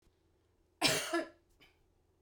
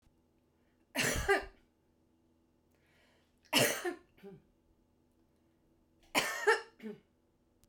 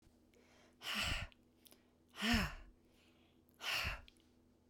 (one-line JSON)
{"cough_length": "2.2 s", "cough_amplitude": 7522, "cough_signal_mean_std_ratio": 0.34, "three_cough_length": "7.7 s", "three_cough_amplitude": 8277, "three_cough_signal_mean_std_ratio": 0.32, "exhalation_length": "4.7 s", "exhalation_amplitude": 2675, "exhalation_signal_mean_std_ratio": 0.43, "survey_phase": "beta (2021-08-13 to 2022-03-07)", "age": "45-64", "gender": "Female", "wearing_mask": "No", "symptom_none": true, "smoker_status": "Never smoked", "respiratory_condition_asthma": false, "respiratory_condition_other": false, "recruitment_source": "REACT", "submission_delay": "1 day", "covid_test_result": "Negative", "covid_test_method": "RT-qPCR", "influenza_a_test_result": "Unknown/Void", "influenza_b_test_result": "Unknown/Void"}